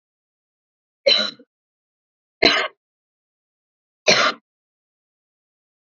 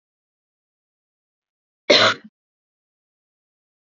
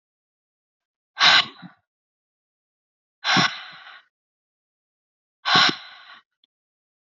three_cough_length: 6.0 s
three_cough_amplitude: 29199
three_cough_signal_mean_std_ratio: 0.26
cough_length: 3.9 s
cough_amplitude: 27772
cough_signal_mean_std_ratio: 0.19
exhalation_length: 7.1 s
exhalation_amplitude: 25904
exhalation_signal_mean_std_ratio: 0.28
survey_phase: alpha (2021-03-01 to 2021-08-12)
age: 18-44
gender: Female
wearing_mask: 'No'
symptom_none: true
smoker_status: Never smoked
respiratory_condition_asthma: false
respiratory_condition_other: false
recruitment_source: REACT
submission_delay: 1 day
covid_test_result: Negative
covid_test_method: RT-qPCR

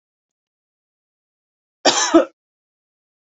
cough_length: 3.2 s
cough_amplitude: 28980
cough_signal_mean_std_ratio: 0.24
survey_phase: beta (2021-08-13 to 2022-03-07)
age: 18-44
gender: Female
wearing_mask: 'No'
symptom_none: true
symptom_onset: 4 days
smoker_status: Never smoked
respiratory_condition_asthma: false
respiratory_condition_other: false
recruitment_source: Test and Trace
submission_delay: 2 days
covid_test_result: Positive
covid_test_method: RT-qPCR
covid_ct_value: 20.6
covid_ct_gene: N gene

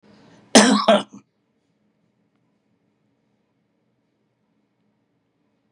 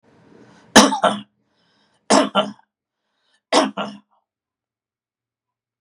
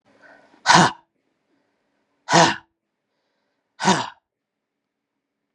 cough_length: 5.7 s
cough_amplitude: 32768
cough_signal_mean_std_ratio: 0.21
three_cough_length: 5.8 s
three_cough_amplitude: 32768
three_cough_signal_mean_std_ratio: 0.29
exhalation_length: 5.5 s
exhalation_amplitude: 31711
exhalation_signal_mean_std_ratio: 0.27
survey_phase: beta (2021-08-13 to 2022-03-07)
age: 45-64
gender: Male
wearing_mask: 'No'
symptom_none: true
smoker_status: Never smoked
respiratory_condition_asthma: true
respiratory_condition_other: false
recruitment_source: REACT
submission_delay: 1 day
covid_test_result: Negative
covid_test_method: RT-qPCR
influenza_a_test_result: Negative
influenza_b_test_result: Negative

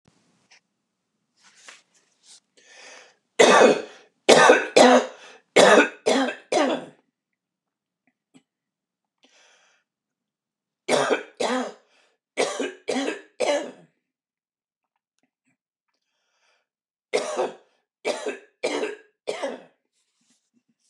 three_cough_length: 20.9 s
three_cough_amplitude: 29204
three_cough_signal_mean_std_ratio: 0.32
survey_phase: beta (2021-08-13 to 2022-03-07)
age: 65+
gender: Male
wearing_mask: 'No'
symptom_runny_or_blocked_nose: true
smoker_status: Ex-smoker
respiratory_condition_asthma: false
respiratory_condition_other: false
recruitment_source: REACT
submission_delay: 1 day
covid_test_result: Negative
covid_test_method: RT-qPCR
influenza_a_test_result: Negative
influenza_b_test_result: Negative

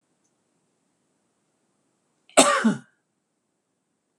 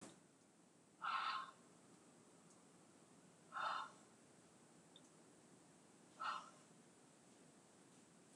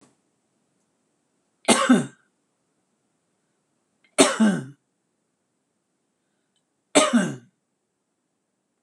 cough_length: 4.2 s
cough_amplitude: 26028
cough_signal_mean_std_ratio: 0.22
exhalation_length: 8.4 s
exhalation_amplitude: 892
exhalation_signal_mean_std_ratio: 0.45
three_cough_length: 8.8 s
three_cough_amplitude: 26027
three_cough_signal_mean_std_ratio: 0.27
survey_phase: beta (2021-08-13 to 2022-03-07)
age: 45-64
gender: Female
wearing_mask: 'No'
symptom_fatigue: true
symptom_headache: true
symptom_onset: 12 days
smoker_status: Ex-smoker
respiratory_condition_asthma: false
respiratory_condition_other: false
recruitment_source: REACT
submission_delay: 3 days
covid_test_result: Negative
covid_test_method: RT-qPCR
influenza_a_test_result: Negative
influenza_b_test_result: Negative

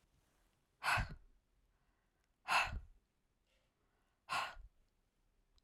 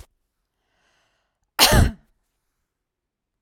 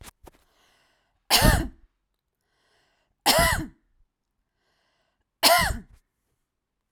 exhalation_length: 5.6 s
exhalation_amplitude: 2671
exhalation_signal_mean_std_ratio: 0.31
cough_length: 3.4 s
cough_amplitude: 32768
cough_signal_mean_std_ratio: 0.24
three_cough_length: 6.9 s
three_cough_amplitude: 25931
three_cough_signal_mean_std_ratio: 0.31
survey_phase: alpha (2021-03-01 to 2021-08-12)
age: 18-44
gender: Female
wearing_mask: 'No'
symptom_none: true
smoker_status: Ex-smoker
respiratory_condition_asthma: false
respiratory_condition_other: false
recruitment_source: REACT
submission_delay: 2 days
covid_test_result: Negative
covid_test_method: RT-qPCR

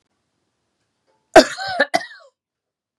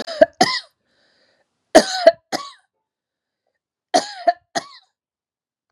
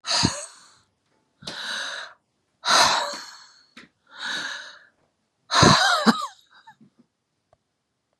cough_length: 3.0 s
cough_amplitude: 32768
cough_signal_mean_std_ratio: 0.22
three_cough_length: 5.7 s
three_cough_amplitude: 32768
three_cough_signal_mean_std_ratio: 0.25
exhalation_length: 8.2 s
exhalation_amplitude: 29494
exhalation_signal_mean_std_ratio: 0.39
survey_phase: beta (2021-08-13 to 2022-03-07)
age: 65+
gender: Female
wearing_mask: 'No'
symptom_none: true
smoker_status: Never smoked
respiratory_condition_asthma: false
respiratory_condition_other: false
recruitment_source: REACT
submission_delay: 3 days
covid_test_result: Negative
covid_test_method: RT-qPCR
influenza_a_test_result: Negative
influenza_b_test_result: Negative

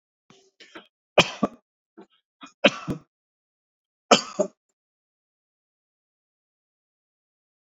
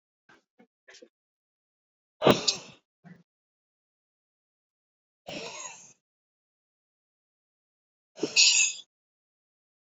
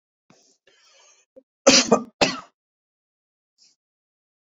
three_cough_length: 7.7 s
three_cough_amplitude: 28575
three_cough_signal_mean_std_ratio: 0.17
exhalation_length: 9.9 s
exhalation_amplitude: 18854
exhalation_signal_mean_std_ratio: 0.22
cough_length: 4.4 s
cough_amplitude: 27373
cough_signal_mean_std_ratio: 0.23
survey_phase: beta (2021-08-13 to 2022-03-07)
age: 45-64
gender: Male
wearing_mask: 'No'
symptom_none: true
smoker_status: Never smoked
respiratory_condition_asthma: false
respiratory_condition_other: false
recruitment_source: REACT
submission_delay: 3 days
covid_test_result: Negative
covid_test_method: RT-qPCR
covid_ct_value: 44.0
covid_ct_gene: N gene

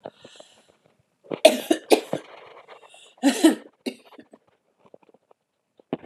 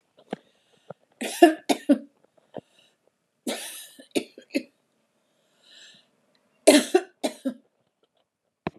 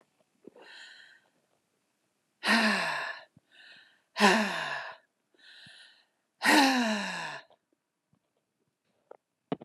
cough_length: 6.1 s
cough_amplitude: 32412
cough_signal_mean_std_ratio: 0.25
three_cough_length: 8.8 s
three_cough_amplitude: 29873
three_cough_signal_mean_std_ratio: 0.24
exhalation_length: 9.6 s
exhalation_amplitude: 11169
exhalation_signal_mean_std_ratio: 0.37
survey_phase: beta (2021-08-13 to 2022-03-07)
age: 65+
gender: Female
wearing_mask: 'No'
symptom_cough_any: true
symptom_runny_or_blocked_nose: true
symptom_headache: true
symptom_onset: 6 days
smoker_status: Ex-smoker
respiratory_condition_asthma: false
respiratory_condition_other: false
recruitment_source: REACT
submission_delay: 1 day
covid_test_result: Negative
covid_test_method: RT-qPCR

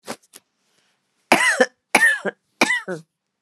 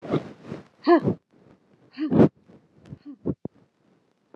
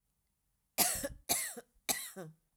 cough_length: 3.4 s
cough_amplitude: 29204
cough_signal_mean_std_ratio: 0.39
exhalation_length: 4.4 s
exhalation_amplitude: 21369
exhalation_signal_mean_std_ratio: 0.32
three_cough_length: 2.6 s
three_cough_amplitude: 7465
three_cough_signal_mean_std_ratio: 0.42
survey_phase: alpha (2021-03-01 to 2021-08-12)
age: 45-64
gender: Female
wearing_mask: 'No'
symptom_none: true
smoker_status: Never smoked
respiratory_condition_asthma: false
respiratory_condition_other: false
recruitment_source: REACT
submission_delay: 2 days
covid_test_result: Negative
covid_test_method: RT-qPCR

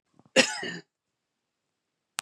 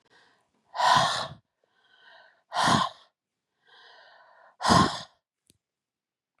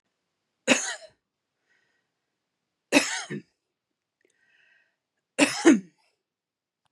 cough_length: 2.2 s
cough_amplitude: 24737
cough_signal_mean_std_ratio: 0.24
exhalation_length: 6.4 s
exhalation_amplitude: 15021
exhalation_signal_mean_std_ratio: 0.34
three_cough_length: 6.9 s
three_cough_amplitude: 20567
three_cough_signal_mean_std_ratio: 0.24
survey_phase: beta (2021-08-13 to 2022-03-07)
age: 45-64
gender: Female
wearing_mask: 'No'
symptom_none: true
symptom_onset: 9 days
smoker_status: Ex-smoker
respiratory_condition_asthma: false
respiratory_condition_other: false
recruitment_source: REACT
submission_delay: 1 day
covid_test_result: Negative
covid_test_method: RT-qPCR
influenza_a_test_result: Unknown/Void
influenza_b_test_result: Unknown/Void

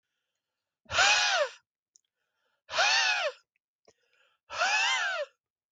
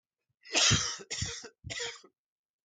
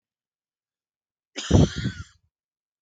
exhalation_length: 5.7 s
exhalation_amplitude: 8905
exhalation_signal_mean_std_ratio: 0.49
three_cough_length: 2.6 s
three_cough_amplitude: 8181
three_cough_signal_mean_std_ratio: 0.44
cough_length: 2.8 s
cough_amplitude: 22204
cough_signal_mean_std_ratio: 0.27
survey_phase: beta (2021-08-13 to 2022-03-07)
age: 45-64
gender: Male
wearing_mask: 'No'
symptom_cough_any: true
symptom_runny_or_blocked_nose: true
symptom_fatigue: true
symptom_headache: true
symptom_onset: 2 days
smoker_status: Ex-smoker
respiratory_condition_asthma: false
respiratory_condition_other: false
recruitment_source: Test and Trace
submission_delay: 1 day
covid_test_result: Positive
covid_test_method: RT-qPCR
covid_ct_value: 30.7
covid_ct_gene: N gene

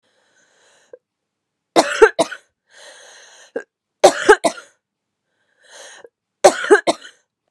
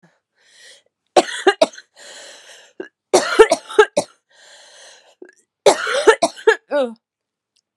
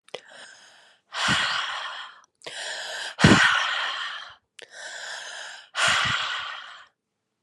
three_cough_length: 7.5 s
three_cough_amplitude: 32768
three_cough_signal_mean_std_ratio: 0.26
cough_length: 7.8 s
cough_amplitude: 32768
cough_signal_mean_std_ratio: 0.33
exhalation_length: 7.4 s
exhalation_amplitude: 25655
exhalation_signal_mean_std_ratio: 0.51
survey_phase: beta (2021-08-13 to 2022-03-07)
age: 18-44
gender: Female
wearing_mask: 'No'
symptom_cough_any: true
symptom_new_continuous_cough: true
symptom_runny_or_blocked_nose: true
symptom_sore_throat: true
symptom_fatigue: true
symptom_headache: true
symptom_change_to_sense_of_smell_or_taste: true
symptom_other: true
symptom_onset: 5 days
smoker_status: Never smoked
respiratory_condition_asthma: false
respiratory_condition_other: false
recruitment_source: Test and Trace
submission_delay: 1 day
covid_test_result: Positive
covid_test_method: ePCR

